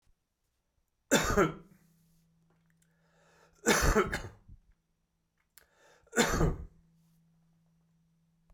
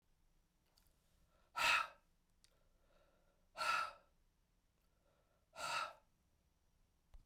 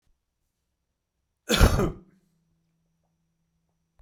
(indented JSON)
{
  "three_cough_length": "8.5 s",
  "three_cough_amplitude": 9425,
  "three_cough_signal_mean_std_ratio": 0.32,
  "exhalation_length": "7.3 s",
  "exhalation_amplitude": 2744,
  "exhalation_signal_mean_std_ratio": 0.3,
  "cough_length": "4.0 s",
  "cough_amplitude": 21133,
  "cough_signal_mean_std_ratio": 0.23,
  "survey_phase": "beta (2021-08-13 to 2022-03-07)",
  "age": "45-64",
  "gender": "Male",
  "wearing_mask": "No",
  "symptom_cough_any": true,
  "symptom_runny_or_blocked_nose": true,
  "symptom_shortness_of_breath": true,
  "symptom_fatigue": true,
  "symptom_onset": "8 days",
  "smoker_status": "Never smoked",
  "respiratory_condition_asthma": false,
  "respiratory_condition_other": false,
  "recruitment_source": "Test and Trace",
  "submission_delay": "2 days",
  "covid_test_result": "Positive",
  "covid_test_method": "RT-qPCR",
  "covid_ct_value": 28.2,
  "covid_ct_gene": "ORF1ab gene",
  "covid_ct_mean": 28.7,
  "covid_viral_load": "390 copies/ml",
  "covid_viral_load_category": "Minimal viral load (< 10K copies/ml)"
}